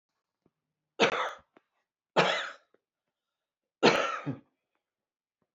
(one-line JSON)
{"three_cough_length": "5.5 s", "three_cough_amplitude": 16434, "three_cough_signal_mean_std_ratio": 0.31, "survey_phase": "beta (2021-08-13 to 2022-03-07)", "age": "65+", "gender": "Female", "wearing_mask": "No", "symptom_cough_any": true, "symptom_shortness_of_breath": true, "smoker_status": "Ex-smoker", "respiratory_condition_asthma": false, "respiratory_condition_other": false, "recruitment_source": "REACT", "submission_delay": "2 days", "covid_test_result": "Negative", "covid_test_method": "RT-qPCR"}